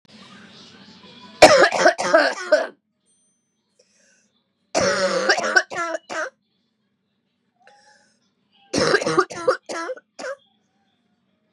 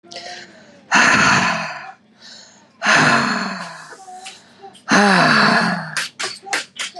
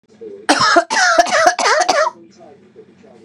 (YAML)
three_cough_length: 11.5 s
three_cough_amplitude: 32768
three_cough_signal_mean_std_ratio: 0.37
exhalation_length: 7.0 s
exhalation_amplitude: 32354
exhalation_signal_mean_std_ratio: 0.58
cough_length: 3.2 s
cough_amplitude: 32768
cough_signal_mean_std_ratio: 0.61
survey_phase: beta (2021-08-13 to 2022-03-07)
age: 18-44
gender: Female
wearing_mask: 'No'
symptom_cough_any: true
symptom_runny_or_blocked_nose: true
symptom_sore_throat: true
symptom_fatigue: true
symptom_headache: true
symptom_other: true
symptom_onset: 3 days
smoker_status: Never smoked
respiratory_condition_asthma: false
respiratory_condition_other: false
recruitment_source: Test and Trace
submission_delay: 1 day
covid_test_result: Positive
covid_test_method: RT-qPCR